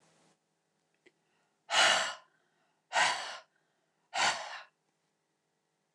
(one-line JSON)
{"exhalation_length": "5.9 s", "exhalation_amplitude": 7068, "exhalation_signal_mean_std_ratio": 0.33, "survey_phase": "beta (2021-08-13 to 2022-03-07)", "age": "45-64", "gender": "Female", "wearing_mask": "No", "symptom_none": true, "smoker_status": "Never smoked", "respiratory_condition_asthma": false, "respiratory_condition_other": false, "recruitment_source": "REACT", "submission_delay": "1 day", "covid_test_result": "Negative", "covid_test_method": "RT-qPCR"}